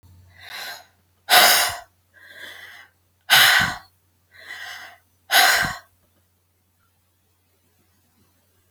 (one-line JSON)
{"exhalation_length": "8.7 s", "exhalation_amplitude": 32768, "exhalation_signal_mean_std_ratio": 0.33, "survey_phase": "alpha (2021-03-01 to 2021-08-12)", "age": "45-64", "gender": "Female", "wearing_mask": "No", "symptom_none": true, "smoker_status": "Never smoked", "respiratory_condition_asthma": true, "respiratory_condition_other": false, "recruitment_source": "REACT", "submission_delay": "3 days", "covid_test_result": "Negative", "covid_test_method": "RT-qPCR"}